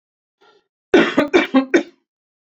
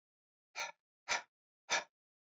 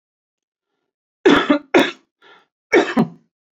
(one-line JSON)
{"cough_length": "2.5 s", "cough_amplitude": 27886, "cough_signal_mean_std_ratio": 0.39, "exhalation_length": "2.3 s", "exhalation_amplitude": 3068, "exhalation_signal_mean_std_ratio": 0.3, "three_cough_length": "3.6 s", "three_cough_amplitude": 32220, "three_cough_signal_mean_std_ratio": 0.36, "survey_phase": "alpha (2021-03-01 to 2021-08-12)", "age": "45-64", "gender": "Male", "wearing_mask": "No", "symptom_fatigue": true, "symptom_headache": true, "symptom_onset": "5 days", "smoker_status": "Never smoked", "respiratory_condition_asthma": false, "respiratory_condition_other": false, "recruitment_source": "Test and Trace", "submission_delay": "1 day", "covid_test_result": "Positive", "covid_test_method": "RT-qPCR", "covid_ct_value": 18.8, "covid_ct_gene": "ORF1ab gene", "covid_ct_mean": 19.1, "covid_viral_load": "560000 copies/ml", "covid_viral_load_category": "Low viral load (10K-1M copies/ml)"}